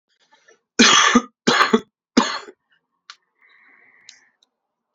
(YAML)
three_cough_length: 4.9 s
three_cough_amplitude: 30693
three_cough_signal_mean_std_ratio: 0.33
survey_phase: beta (2021-08-13 to 2022-03-07)
age: 18-44
gender: Male
wearing_mask: 'No'
symptom_cough_any: true
symptom_shortness_of_breath: true
symptom_fever_high_temperature: true
symptom_change_to_sense_of_smell_or_taste: true
smoker_status: Ex-smoker
respiratory_condition_asthma: true
respiratory_condition_other: false
recruitment_source: Test and Trace
submission_delay: 2 days
covid_test_result: Positive
covid_test_method: LFT